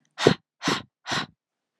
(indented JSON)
{
  "exhalation_length": "1.8 s",
  "exhalation_amplitude": 27673,
  "exhalation_signal_mean_std_ratio": 0.34,
  "survey_phase": "alpha (2021-03-01 to 2021-08-12)",
  "age": "18-44",
  "gender": "Female",
  "wearing_mask": "No",
  "symptom_fatigue": true,
  "symptom_headache": true,
  "symptom_onset": "3 days",
  "smoker_status": "Never smoked",
  "respiratory_condition_asthma": false,
  "respiratory_condition_other": false,
  "recruitment_source": "Test and Trace",
  "submission_delay": "1 day",
  "covid_test_result": "Positive",
  "covid_test_method": "RT-qPCR",
  "covid_ct_value": 13.9,
  "covid_ct_gene": "ORF1ab gene",
  "covid_ct_mean": 14.1,
  "covid_viral_load": "23000000 copies/ml",
  "covid_viral_load_category": "High viral load (>1M copies/ml)"
}